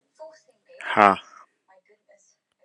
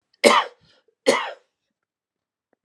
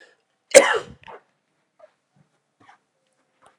{
  "exhalation_length": "2.6 s",
  "exhalation_amplitude": 32411,
  "exhalation_signal_mean_std_ratio": 0.2,
  "three_cough_length": "2.6 s",
  "three_cough_amplitude": 32664,
  "three_cough_signal_mean_std_ratio": 0.28,
  "cough_length": "3.6 s",
  "cough_amplitude": 32768,
  "cough_signal_mean_std_ratio": 0.18,
  "survey_phase": "alpha (2021-03-01 to 2021-08-12)",
  "age": "18-44",
  "gender": "Male",
  "wearing_mask": "No",
  "symptom_none": true,
  "smoker_status": "Never smoked",
  "respiratory_condition_asthma": false,
  "respiratory_condition_other": false,
  "recruitment_source": "REACT",
  "submission_delay": "3 days",
  "covid_test_result": "Negative",
  "covid_test_method": "RT-qPCR"
}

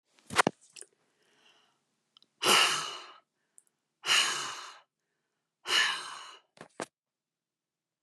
{
  "exhalation_length": "8.0 s",
  "exhalation_amplitude": 12273,
  "exhalation_signal_mean_std_ratio": 0.33,
  "survey_phase": "alpha (2021-03-01 to 2021-08-12)",
  "age": "65+",
  "gender": "Female",
  "wearing_mask": "No",
  "symptom_cough_any": true,
  "smoker_status": "Never smoked",
  "respiratory_condition_asthma": false,
  "respiratory_condition_other": false,
  "recruitment_source": "REACT",
  "submission_delay": "2 days",
  "covid_test_result": "Negative",
  "covid_test_method": "RT-qPCR"
}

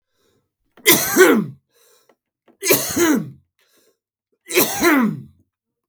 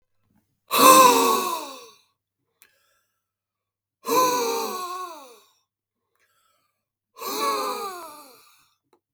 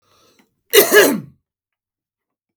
{
  "three_cough_length": "5.9 s",
  "three_cough_amplitude": 32768,
  "three_cough_signal_mean_std_ratio": 0.44,
  "exhalation_length": "9.1 s",
  "exhalation_amplitude": 32456,
  "exhalation_signal_mean_std_ratio": 0.36,
  "cough_length": "2.6 s",
  "cough_amplitude": 32768,
  "cough_signal_mean_std_ratio": 0.32,
  "survey_phase": "beta (2021-08-13 to 2022-03-07)",
  "age": "45-64",
  "gender": "Male",
  "wearing_mask": "No",
  "symptom_cough_any": true,
  "symptom_onset": "2 days",
  "smoker_status": "Never smoked",
  "respiratory_condition_asthma": false,
  "respiratory_condition_other": false,
  "recruitment_source": "Test and Trace",
  "submission_delay": "2 days",
  "covid_test_result": "Positive",
  "covid_test_method": "RT-qPCR",
  "covid_ct_value": 16.2,
  "covid_ct_gene": "N gene"
}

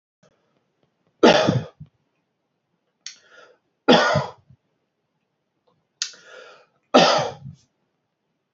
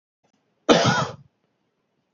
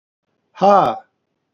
{
  "three_cough_length": "8.5 s",
  "three_cough_amplitude": 27979,
  "three_cough_signal_mean_std_ratio": 0.28,
  "cough_length": "2.1 s",
  "cough_amplitude": 27458,
  "cough_signal_mean_std_ratio": 0.33,
  "exhalation_length": "1.5 s",
  "exhalation_amplitude": 29614,
  "exhalation_signal_mean_std_ratio": 0.36,
  "survey_phase": "beta (2021-08-13 to 2022-03-07)",
  "age": "65+",
  "gender": "Male",
  "wearing_mask": "No",
  "symptom_cough_any": true,
  "smoker_status": "Ex-smoker",
  "respiratory_condition_asthma": false,
  "respiratory_condition_other": false,
  "recruitment_source": "Test and Trace",
  "submission_delay": "2 days",
  "covid_test_result": "Positive",
  "covid_test_method": "ePCR"
}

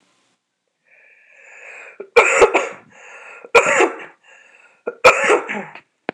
{
  "three_cough_length": "6.1 s",
  "three_cough_amplitude": 26028,
  "three_cough_signal_mean_std_ratio": 0.37,
  "survey_phase": "alpha (2021-03-01 to 2021-08-12)",
  "age": "18-44",
  "gender": "Female",
  "wearing_mask": "No",
  "symptom_none": true,
  "smoker_status": "Never smoked",
  "respiratory_condition_asthma": false,
  "respiratory_condition_other": false,
  "recruitment_source": "REACT",
  "submission_delay": "2 days",
  "covid_test_result": "Negative",
  "covid_test_method": "RT-qPCR"
}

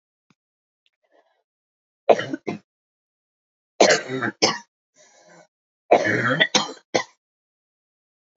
{
  "three_cough_length": "8.4 s",
  "three_cough_amplitude": 28830,
  "three_cough_signal_mean_std_ratio": 0.3,
  "survey_phase": "beta (2021-08-13 to 2022-03-07)",
  "age": "18-44",
  "gender": "Female",
  "wearing_mask": "No",
  "symptom_cough_any": true,
  "symptom_new_continuous_cough": true,
  "symptom_runny_or_blocked_nose": true,
  "symptom_shortness_of_breath": true,
  "symptom_fatigue": true,
  "symptom_onset": "12 days",
  "smoker_status": "Never smoked",
  "respiratory_condition_asthma": false,
  "respiratory_condition_other": false,
  "recruitment_source": "REACT",
  "submission_delay": "1 day",
  "covid_test_result": "Positive",
  "covid_test_method": "RT-qPCR",
  "covid_ct_value": 30.3,
  "covid_ct_gene": "E gene",
  "influenza_a_test_result": "Negative",
  "influenza_b_test_result": "Negative"
}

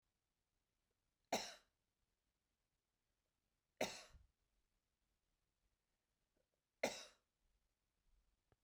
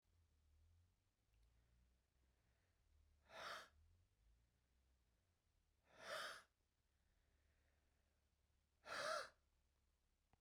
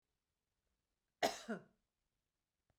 {
  "three_cough_length": "8.6 s",
  "three_cough_amplitude": 1558,
  "three_cough_signal_mean_std_ratio": 0.19,
  "exhalation_length": "10.4 s",
  "exhalation_amplitude": 586,
  "exhalation_signal_mean_std_ratio": 0.31,
  "cough_length": "2.8 s",
  "cough_amplitude": 2480,
  "cough_signal_mean_std_ratio": 0.21,
  "survey_phase": "beta (2021-08-13 to 2022-03-07)",
  "age": "45-64",
  "gender": "Female",
  "wearing_mask": "No",
  "symptom_none": true,
  "smoker_status": "Never smoked",
  "respiratory_condition_asthma": false,
  "respiratory_condition_other": false,
  "recruitment_source": "REACT",
  "submission_delay": "1 day",
  "covid_test_result": "Negative",
  "covid_test_method": "RT-qPCR",
  "influenza_a_test_result": "Unknown/Void",
  "influenza_b_test_result": "Unknown/Void"
}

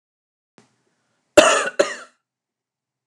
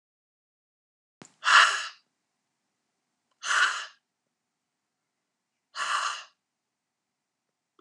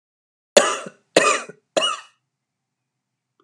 {
  "cough_length": "3.1 s",
  "cough_amplitude": 32768,
  "cough_signal_mean_std_ratio": 0.26,
  "exhalation_length": "7.8 s",
  "exhalation_amplitude": 19238,
  "exhalation_signal_mean_std_ratio": 0.26,
  "three_cough_length": "3.4 s",
  "three_cough_amplitude": 32768,
  "three_cough_signal_mean_std_ratio": 0.31,
  "survey_phase": "alpha (2021-03-01 to 2021-08-12)",
  "age": "45-64",
  "gender": "Female",
  "wearing_mask": "No",
  "symptom_fatigue": true,
  "symptom_onset": "12 days",
  "smoker_status": "Ex-smoker",
  "respiratory_condition_asthma": false,
  "respiratory_condition_other": false,
  "recruitment_source": "REACT",
  "submission_delay": "3 days",
  "covid_test_result": "Negative",
  "covid_test_method": "RT-qPCR"
}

